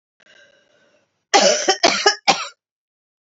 {"cough_length": "3.2 s", "cough_amplitude": 30974, "cough_signal_mean_std_ratio": 0.39, "survey_phase": "beta (2021-08-13 to 2022-03-07)", "age": "45-64", "gender": "Female", "wearing_mask": "No", "symptom_cough_any": true, "symptom_new_continuous_cough": true, "symptom_runny_or_blocked_nose": true, "symptom_shortness_of_breath": true, "symptom_sore_throat": true, "symptom_fatigue": true, "symptom_fever_high_temperature": true, "symptom_headache": true, "smoker_status": "Ex-smoker", "respiratory_condition_asthma": false, "respiratory_condition_other": false, "recruitment_source": "Test and Trace", "submission_delay": "1 day", "covid_test_result": "Positive", "covid_test_method": "LFT"}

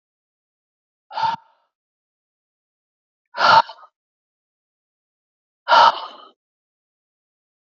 {"exhalation_length": "7.7 s", "exhalation_amplitude": 29557, "exhalation_signal_mean_std_ratio": 0.23, "survey_phase": "beta (2021-08-13 to 2022-03-07)", "age": "18-44", "gender": "Male", "wearing_mask": "No", "symptom_none": true, "smoker_status": "Never smoked", "respiratory_condition_asthma": false, "respiratory_condition_other": false, "recruitment_source": "REACT", "submission_delay": "3 days", "covid_test_result": "Negative", "covid_test_method": "RT-qPCR"}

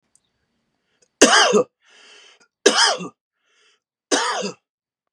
{"three_cough_length": "5.1 s", "three_cough_amplitude": 32768, "three_cough_signal_mean_std_ratio": 0.35, "survey_phase": "beta (2021-08-13 to 2022-03-07)", "age": "18-44", "gender": "Male", "wearing_mask": "No", "symptom_sore_throat": true, "symptom_onset": "7 days", "smoker_status": "Never smoked", "respiratory_condition_asthma": false, "respiratory_condition_other": false, "recruitment_source": "REACT", "submission_delay": "3 days", "covid_test_result": "Negative", "covid_test_method": "RT-qPCR", "influenza_a_test_result": "Negative", "influenza_b_test_result": "Negative"}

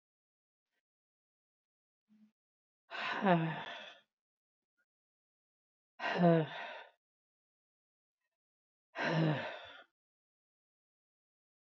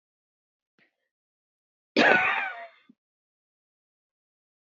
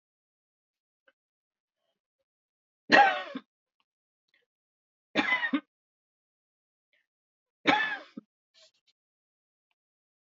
{"exhalation_length": "11.8 s", "exhalation_amplitude": 6181, "exhalation_signal_mean_std_ratio": 0.29, "cough_length": "4.6 s", "cough_amplitude": 21881, "cough_signal_mean_std_ratio": 0.26, "three_cough_length": "10.3 s", "three_cough_amplitude": 17717, "three_cough_signal_mean_std_ratio": 0.22, "survey_phase": "alpha (2021-03-01 to 2021-08-12)", "age": "65+", "gender": "Female", "wearing_mask": "No", "symptom_none": true, "smoker_status": "Ex-smoker", "respiratory_condition_asthma": false, "respiratory_condition_other": true, "recruitment_source": "REACT", "submission_delay": "1 day", "covid_test_result": "Negative", "covid_test_method": "RT-qPCR"}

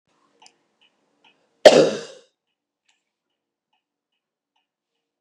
{"cough_length": "5.2 s", "cough_amplitude": 32768, "cough_signal_mean_std_ratio": 0.16, "survey_phase": "beta (2021-08-13 to 2022-03-07)", "age": "65+", "gender": "Female", "wearing_mask": "No", "symptom_runny_or_blocked_nose": true, "symptom_headache": true, "smoker_status": "Never smoked", "respiratory_condition_asthma": false, "respiratory_condition_other": false, "recruitment_source": "REACT", "submission_delay": "2 days", "covid_test_result": "Negative", "covid_test_method": "RT-qPCR", "influenza_a_test_result": "Negative", "influenza_b_test_result": "Negative"}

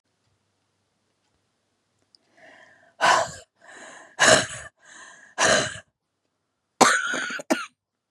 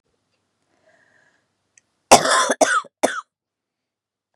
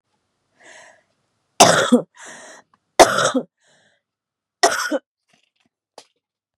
{"exhalation_length": "8.1 s", "exhalation_amplitude": 32645, "exhalation_signal_mean_std_ratio": 0.33, "cough_length": "4.4 s", "cough_amplitude": 32768, "cough_signal_mean_std_ratio": 0.28, "three_cough_length": "6.6 s", "three_cough_amplitude": 32768, "three_cough_signal_mean_std_ratio": 0.29, "survey_phase": "beta (2021-08-13 to 2022-03-07)", "age": "45-64", "gender": "Female", "wearing_mask": "No", "symptom_new_continuous_cough": true, "symptom_fever_high_temperature": true, "symptom_onset": "3 days", "smoker_status": "Ex-smoker", "respiratory_condition_asthma": false, "respiratory_condition_other": false, "recruitment_source": "Test and Trace", "submission_delay": "1 day", "covid_test_result": "Negative", "covid_test_method": "RT-qPCR"}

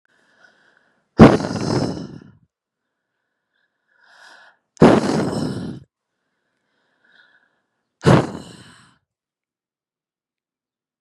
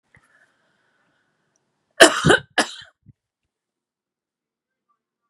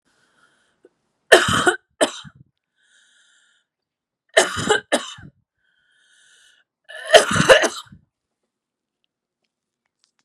{"exhalation_length": "11.0 s", "exhalation_amplitude": 32768, "exhalation_signal_mean_std_ratio": 0.26, "cough_length": "5.3 s", "cough_amplitude": 32768, "cough_signal_mean_std_ratio": 0.19, "three_cough_length": "10.2 s", "three_cough_amplitude": 32768, "three_cough_signal_mean_std_ratio": 0.27, "survey_phase": "beta (2021-08-13 to 2022-03-07)", "age": "18-44", "gender": "Female", "wearing_mask": "No", "symptom_runny_or_blocked_nose": true, "symptom_sore_throat": true, "symptom_abdominal_pain": true, "symptom_diarrhoea": true, "symptom_fatigue": true, "symptom_headache": true, "symptom_onset": "3 days", "smoker_status": "Ex-smoker", "respiratory_condition_asthma": false, "respiratory_condition_other": false, "recruitment_source": "Test and Trace", "submission_delay": "1 day", "covid_test_result": "Positive", "covid_test_method": "RT-qPCR", "covid_ct_value": 19.0, "covid_ct_gene": "ORF1ab gene"}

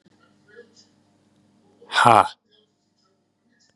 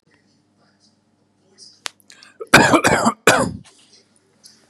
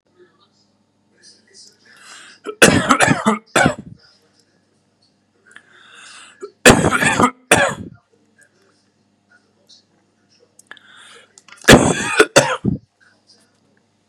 {"exhalation_length": "3.8 s", "exhalation_amplitude": 32767, "exhalation_signal_mean_std_ratio": 0.21, "cough_length": "4.7 s", "cough_amplitude": 32768, "cough_signal_mean_std_ratio": 0.32, "three_cough_length": "14.1 s", "three_cough_amplitude": 32768, "three_cough_signal_mean_std_ratio": 0.32, "survey_phase": "beta (2021-08-13 to 2022-03-07)", "age": "45-64", "gender": "Male", "wearing_mask": "No", "symptom_new_continuous_cough": true, "symptom_runny_or_blocked_nose": true, "symptom_onset": "3 days", "smoker_status": "Never smoked", "respiratory_condition_asthma": false, "respiratory_condition_other": false, "recruitment_source": "Test and Trace", "submission_delay": "2 days", "covid_test_result": "Positive", "covid_test_method": "RT-qPCR", "covid_ct_value": 21.0, "covid_ct_gene": "ORF1ab gene", "covid_ct_mean": 21.2, "covid_viral_load": "110000 copies/ml", "covid_viral_load_category": "Low viral load (10K-1M copies/ml)"}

